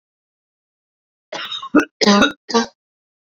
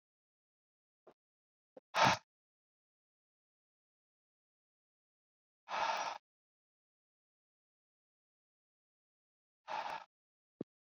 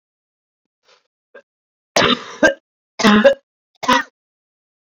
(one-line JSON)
{"cough_length": "3.2 s", "cough_amplitude": 29265, "cough_signal_mean_std_ratio": 0.36, "exhalation_length": "10.9 s", "exhalation_amplitude": 4855, "exhalation_signal_mean_std_ratio": 0.2, "three_cough_length": "4.9 s", "three_cough_amplitude": 29321, "three_cough_signal_mean_std_ratio": 0.33, "survey_phase": "beta (2021-08-13 to 2022-03-07)", "age": "18-44", "gender": "Male", "wearing_mask": "No", "symptom_cough_any": true, "symptom_new_continuous_cough": true, "symptom_headache": true, "symptom_change_to_sense_of_smell_or_taste": true, "symptom_loss_of_taste": true, "smoker_status": "Never smoked", "respiratory_condition_asthma": false, "respiratory_condition_other": false, "recruitment_source": "Test and Trace", "submission_delay": "2 days", "covid_test_result": "Positive", "covid_test_method": "RT-qPCR", "covid_ct_value": 14.8, "covid_ct_gene": "N gene", "covid_ct_mean": 15.4, "covid_viral_load": "8700000 copies/ml", "covid_viral_load_category": "High viral load (>1M copies/ml)"}